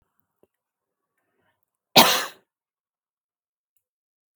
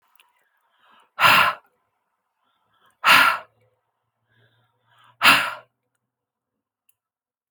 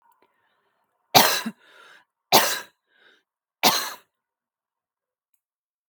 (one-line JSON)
{"cough_length": "4.4 s", "cough_amplitude": 32766, "cough_signal_mean_std_ratio": 0.17, "exhalation_length": "7.5 s", "exhalation_amplitude": 32768, "exhalation_signal_mean_std_ratio": 0.27, "three_cough_length": "5.9 s", "three_cough_amplitude": 32766, "three_cough_signal_mean_std_ratio": 0.26, "survey_phase": "beta (2021-08-13 to 2022-03-07)", "age": "45-64", "gender": "Female", "wearing_mask": "No", "symptom_none": true, "smoker_status": "Never smoked", "respiratory_condition_asthma": false, "respiratory_condition_other": false, "recruitment_source": "REACT", "submission_delay": "1 day", "covid_test_result": "Negative", "covid_test_method": "RT-qPCR"}